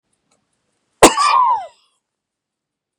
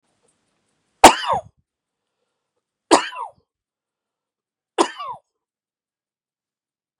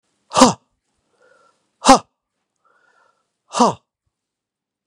{"cough_length": "3.0 s", "cough_amplitude": 32768, "cough_signal_mean_std_ratio": 0.33, "three_cough_length": "7.0 s", "three_cough_amplitude": 32768, "three_cough_signal_mean_std_ratio": 0.18, "exhalation_length": "4.9 s", "exhalation_amplitude": 32768, "exhalation_signal_mean_std_ratio": 0.22, "survey_phase": "beta (2021-08-13 to 2022-03-07)", "age": "65+", "gender": "Male", "wearing_mask": "No", "symptom_none": true, "smoker_status": "Never smoked", "respiratory_condition_asthma": false, "respiratory_condition_other": false, "recruitment_source": "Test and Trace", "submission_delay": "1 day", "covid_test_result": "Negative", "covid_test_method": "RT-qPCR"}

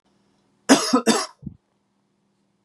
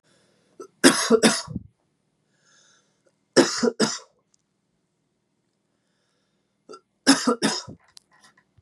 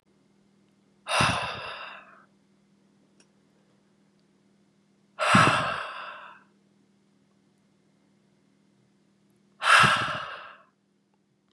{"cough_length": "2.6 s", "cough_amplitude": 30915, "cough_signal_mean_std_ratio": 0.32, "three_cough_length": "8.6 s", "three_cough_amplitude": 30577, "three_cough_signal_mean_std_ratio": 0.29, "exhalation_length": "11.5 s", "exhalation_amplitude": 19734, "exhalation_signal_mean_std_ratio": 0.31, "survey_phase": "beta (2021-08-13 to 2022-03-07)", "age": "18-44", "gender": "Male", "wearing_mask": "No", "symptom_headache": true, "symptom_onset": "6 days", "smoker_status": "Never smoked", "respiratory_condition_asthma": true, "respiratory_condition_other": false, "recruitment_source": "Test and Trace", "submission_delay": "2 days", "covid_test_result": "Positive", "covid_test_method": "RT-qPCR", "covid_ct_value": 34.0, "covid_ct_gene": "ORF1ab gene"}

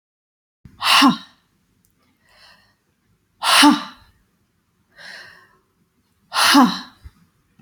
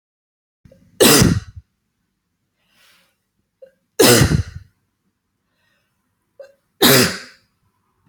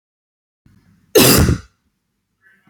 {"exhalation_length": "7.6 s", "exhalation_amplitude": 31115, "exhalation_signal_mean_std_ratio": 0.32, "three_cough_length": "8.1 s", "three_cough_amplitude": 32768, "three_cough_signal_mean_std_ratio": 0.31, "cough_length": "2.7 s", "cough_amplitude": 32767, "cough_signal_mean_std_ratio": 0.33, "survey_phase": "beta (2021-08-13 to 2022-03-07)", "age": "18-44", "gender": "Female", "wearing_mask": "No", "symptom_runny_or_blocked_nose": true, "symptom_fatigue": true, "smoker_status": "Never smoked", "respiratory_condition_asthma": false, "respiratory_condition_other": false, "recruitment_source": "REACT", "submission_delay": "1 day", "covid_test_result": "Negative", "covid_test_method": "RT-qPCR"}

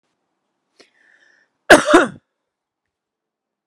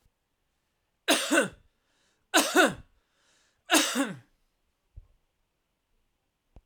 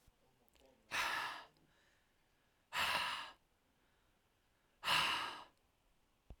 {"cough_length": "3.7 s", "cough_amplitude": 32768, "cough_signal_mean_std_ratio": 0.22, "three_cough_length": "6.7 s", "three_cough_amplitude": 15459, "three_cough_signal_mean_std_ratio": 0.31, "exhalation_length": "6.4 s", "exhalation_amplitude": 3330, "exhalation_signal_mean_std_ratio": 0.41, "survey_phase": "alpha (2021-03-01 to 2021-08-12)", "age": "45-64", "gender": "Male", "wearing_mask": "No", "symptom_none": true, "smoker_status": "Current smoker (1 to 10 cigarettes per day)", "respiratory_condition_asthma": false, "respiratory_condition_other": false, "recruitment_source": "REACT", "submission_delay": "9 days", "covid_test_result": "Negative", "covid_test_method": "RT-qPCR"}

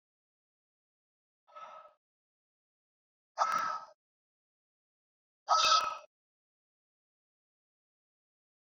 {"exhalation_length": "8.7 s", "exhalation_amplitude": 6621, "exhalation_signal_mean_std_ratio": 0.25, "survey_phase": "beta (2021-08-13 to 2022-03-07)", "age": "65+", "gender": "Male", "wearing_mask": "No", "symptom_shortness_of_breath": true, "symptom_fatigue": true, "smoker_status": "Ex-smoker", "respiratory_condition_asthma": false, "respiratory_condition_other": false, "recruitment_source": "Test and Trace", "submission_delay": "2 days", "covid_test_result": "Positive", "covid_test_method": "LFT"}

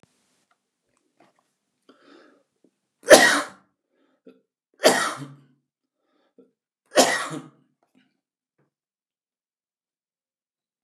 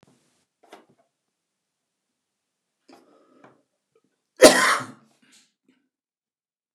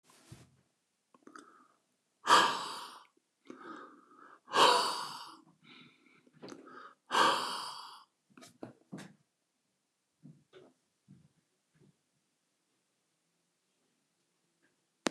{"three_cough_length": "10.8 s", "three_cough_amplitude": 30812, "three_cough_signal_mean_std_ratio": 0.2, "cough_length": "6.7 s", "cough_amplitude": 30489, "cough_signal_mean_std_ratio": 0.17, "exhalation_length": "15.1 s", "exhalation_amplitude": 10532, "exhalation_signal_mean_std_ratio": 0.26, "survey_phase": "beta (2021-08-13 to 2022-03-07)", "age": "65+", "gender": "Male", "wearing_mask": "No", "symptom_cough_any": true, "symptom_onset": "12 days", "smoker_status": "Never smoked", "respiratory_condition_asthma": false, "respiratory_condition_other": false, "recruitment_source": "REACT", "submission_delay": "2 days", "covid_test_result": "Negative", "covid_test_method": "RT-qPCR", "influenza_a_test_result": "Negative", "influenza_b_test_result": "Negative"}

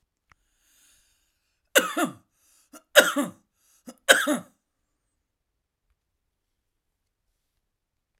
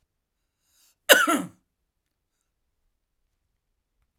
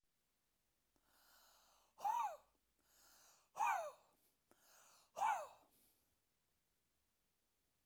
{"three_cough_length": "8.2 s", "three_cough_amplitude": 32767, "three_cough_signal_mean_std_ratio": 0.21, "cough_length": "4.2 s", "cough_amplitude": 32768, "cough_signal_mean_std_ratio": 0.19, "exhalation_length": "7.9 s", "exhalation_amplitude": 1248, "exhalation_signal_mean_std_ratio": 0.31, "survey_phase": "alpha (2021-03-01 to 2021-08-12)", "age": "65+", "gender": "Male", "wearing_mask": "No", "symptom_none": true, "smoker_status": "Ex-smoker", "respiratory_condition_asthma": false, "respiratory_condition_other": false, "recruitment_source": "REACT", "submission_delay": "2 days", "covid_test_result": "Negative", "covid_test_method": "RT-qPCR"}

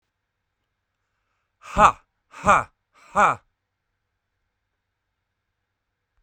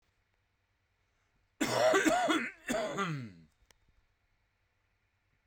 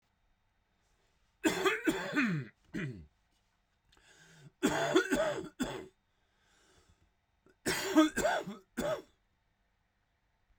{"exhalation_length": "6.2 s", "exhalation_amplitude": 32768, "exhalation_signal_mean_std_ratio": 0.22, "cough_length": "5.5 s", "cough_amplitude": 6132, "cough_signal_mean_std_ratio": 0.42, "three_cough_length": "10.6 s", "three_cough_amplitude": 7166, "three_cough_signal_mean_std_ratio": 0.42, "survey_phase": "beta (2021-08-13 to 2022-03-07)", "age": "18-44", "gender": "Male", "wearing_mask": "No", "symptom_none": true, "smoker_status": "Current smoker (11 or more cigarettes per day)", "respiratory_condition_asthma": false, "respiratory_condition_other": false, "recruitment_source": "REACT", "submission_delay": "8 days", "covid_test_result": "Negative", "covid_test_method": "RT-qPCR", "influenza_a_test_result": "Negative", "influenza_b_test_result": "Negative"}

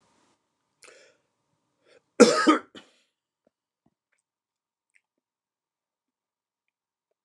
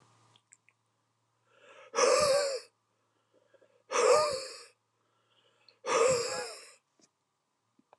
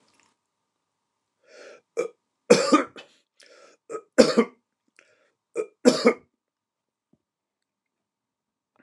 {"cough_length": "7.2 s", "cough_amplitude": 29203, "cough_signal_mean_std_ratio": 0.16, "exhalation_length": "8.0 s", "exhalation_amplitude": 8371, "exhalation_signal_mean_std_ratio": 0.39, "three_cough_length": "8.8 s", "three_cough_amplitude": 29204, "three_cough_signal_mean_std_ratio": 0.23, "survey_phase": "beta (2021-08-13 to 2022-03-07)", "age": "45-64", "gender": "Male", "wearing_mask": "No", "symptom_none": true, "smoker_status": "Never smoked", "respiratory_condition_asthma": false, "respiratory_condition_other": false, "recruitment_source": "REACT", "submission_delay": "1 day", "covid_test_result": "Negative", "covid_test_method": "RT-qPCR", "influenza_a_test_result": "Negative", "influenza_b_test_result": "Negative"}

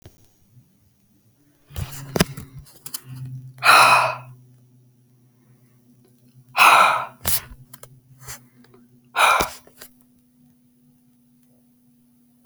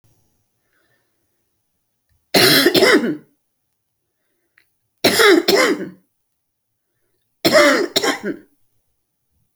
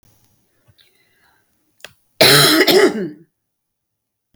{"exhalation_length": "12.5 s", "exhalation_amplitude": 30769, "exhalation_signal_mean_std_ratio": 0.31, "three_cough_length": "9.6 s", "three_cough_amplitude": 32768, "three_cough_signal_mean_std_ratio": 0.39, "cough_length": "4.4 s", "cough_amplitude": 32767, "cough_signal_mean_std_ratio": 0.36, "survey_phase": "beta (2021-08-13 to 2022-03-07)", "age": "65+", "gender": "Female", "wearing_mask": "No", "symptom_cough_any": true, "symptom_headache": true, "symptom_onset": "12 days", "smoker_status": "Never smoked", "respiratory_condition_asthma": true, "respiratory_condition_other": false, "recruitment_source": "REACT", "submission_delay": "1 day", "covid_test_result": "Negative", "covid_test_method": "RT-qPCR"}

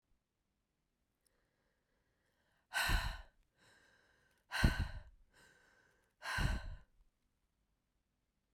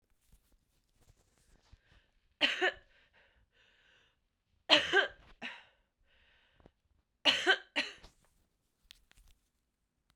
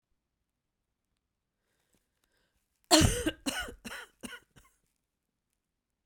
{"exhalation_length": "8.5 s", "exhalation_amplitude": 5232, "exhalation_signal_mean_std_ratio": 0.3, "three_cough_length": "10.2 s", "three_cough_amplitude": 12033, "three_cough_signal_mean_std_ratio": 0.25, "cough_length": "6.1 s", "cough_amplitude": 15027, "cough_signal_mean_std_ratio": 0.23, "survey_phase": "beta (2021-08-13 to 2022-03-07)", "age": "45-64", "gender": "Female", "wearing_mask": "No", "symptom_cough_any": true, "symptom_runny_or_blocked_nose": true, "symptom_shortness_of_breath": true, "symptom_sore_throat": true, "symptom_fatigue": true, "symptom_headache": true, "symptom_change_to_sense_of_smell_or_taste": true, "symptom_onset": "3 days", "smoker_status": "Never smoked", "respiratory_condition_asthma": false, "respiratory_condition_other": false, "recruitment_source": "Test and Trace", "submission_delay": "2 days", "covid_test_result": "Positive", "covid_test_method": "RT-qPCR", "covid_ct_value": 28.4, "covid_ct_gene": "ORF1ab gene"}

